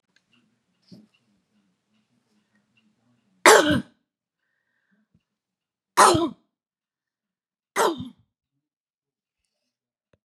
{"three_cough_length": "10.2 s", "three_cough_amplitude": 31492, "three_cough_signal_mean_std_ratio": 0.21, "survey_phase": "beta (2021-08-13 to 2022-03-07)", "age": "45-64", "gender": "Female", "wearing_mask": "No", "symptom_fatigue": true, "symptom_onset": "12 days", "smoker_status": "Never smoked", "respiratory_condition_asthma": false, "respiratory_condition_other": false, "recruitment_source": "REACT", "submission_delay": "2 days", "covid_test_result": "Negative", "covid_test_method": "RT-qPCR", "influenza_a_test_result": "Negative", "influenza_b_test_result": "Negative"}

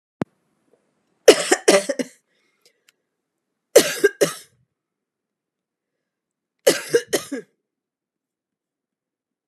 {"three_cough_length": "9.5 s", "three_cough_amplitude": 32768, "three_cough_signal_mean_std_ratio": 0.23, "survey_phase": "beta (2021-08-13 to 2022-03-07)", "age": "18-44", "gender": "Female", "wearing_mask": "No", "symptom_cough_any": true, "symptom_runny_or_blocked_nose": true, "symptom_shortness_of_breath": true, "symptom_sore_throat": true, "symptom_change_to_sense_of_smell_or_taste": true, "symptom_other": true, "symptom_onset": "2 days", "smoker_status": "Ex-smoker", "respiratory_condition_asthma": false, "respiratory_condition_other": false, "recruitment_source": "Test and Trace", "submission_delay": "2 days", "covid_test_result": "Positive", "covid_test_method": "ePCR"}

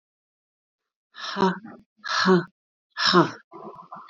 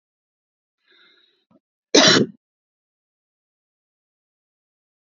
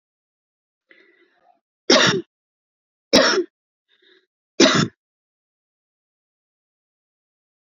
{"exhalation_length": "4.1 s", "exhalation_amplitude": 20949, "exhalation_signal_mean_std_ratio": 0.39, "cough_length": "5.0 s", "cough_amplitude": 31700, "cough_signal_mean_std_ratio": 0.2, "three_cough_length": "7.7 s", "three_cough_amplitude": 31815, "three_cough_signal_mean_std_ratio": 0.26, "survey_phase": "beta (2021-08-13 to 2022-03-07)", "age": "45-64", "gender": "Female", "wearing_mask": "No", "symptom_none": true, "smoker_status": "Never smoked", "respiratory_condition_asthma": false, "respiratory_condition_other": false, "recruitment_source": "REACT", "submission_delay": "1 day", "covid_test_result": "Negative", "covid_test_method": "RT-qPCR", "influenza_a_test_result": "Negative", "influenza_b_test_result": "Negative"}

